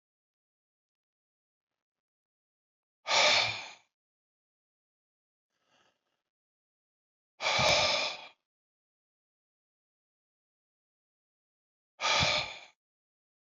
{"exhalation_length": "13.6 s", "exhalation_amplitude": 8110, "exhalation_signal_mean_std_ratio": 0.28, "survey_phase": "beta (2021-08-13 to 2022-03-07)", "age": "65+", "gender": "Male", "wearing_mask": "No", "symptom_none": true, "smoker_status": "Ex-smoker", "respiratory_condition_asthma": false, "respiratory_condition_other": false, "recruitment_source": "REACT", "submission_delay": "4 days", "covid_test_result": "Negative", "covid_test_method": "RT-qPCR", "influenza_a_test_result": "Negative", "influenza_b_test_result": "Negative"}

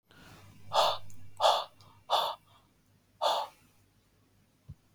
{"exhalation_length": "4.9 s", "exhalation_amplitude": 7857, "exhalation_signal_mean_std_ratio": 0.41, "survey_phase": "beta (2021-08-13 to 2022-03-07)", "age": "18-44", "gender": "Male", "wearing_mask": "No", "symptom_none": true, "smoker_status": "Never smoked", "respiratory_condition_asthma": false, "respiratory_condition_other": false, "recruitment_source": "REACT", "submission_delay": "4 days", "covid_test_result": "Negative", "covid_test_method": "RT-qPCR", "influenza_a_test_result": "Negative", "influenza_b_test_result": "Negative"}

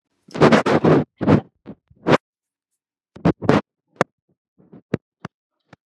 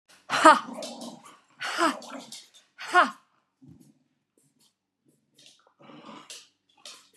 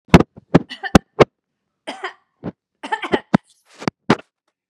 {"cough_length": "5.9 s", "cough_amplitude": 32768, "cough_signal_mean_std_ratio": 0.34, "exhalation_length": "7.2 s", "exhalation_amplitude": 26144, "exhalation_signal_mean_std_ratio": 0.26, "three_cough_length": "4.7 s", "three_cough_amplitude": 32768, "three_cough_signal_mean_std_ratio": 0.23, "survey_phase": "beta (2021-08-13 to 2022-03-07)", "age": "65+", "gender": "Female", "wearing_mask": "No", "symptom_none": true, "smoker_status": "Never smoked", "respiratory_condition_asthma": false, "respiratory_condition_other": false, "recruitment_source": "REACT", "submission_delay": "2 days", "covid_test_result": "Negative", "covid_test_method": "RT-qPCR"}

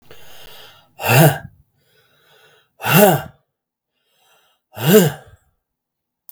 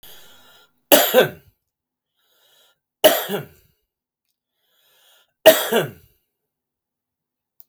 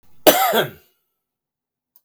{"exhalation_length": "6.3 s", "exhalation_amplitude": 32768, "exhalation_signal_mean_std_ratio": 0.33, "three_cough_length": "7.7 s", "three_cough_amplitude": 32768, "three_cough_signal_mean_std_ratio": 0.26, "cough_length": "2.0 s", "cough_amplitude": 32768, "cough_signal_mean_std_ratio": 0.33, "survey_phase": "beta (2021-08-13 to 2022-03-07)", "age": "45-64", "gender": "Male", "wearing_mask": "No", "symptom_runny_or_blocked_nose": true, "smoker_status": "Never smoked", "respiratory_condition_asthma": false, "respiratory_condition_other": false, "recruitment_source": "REACT", "submission_delay": "2 days", "covid_test_result": "Negative", "covid_test_method": "RT-qPCR", "influenza_a_test_result": "Negative", "influenza_b_test_result": "Negative"}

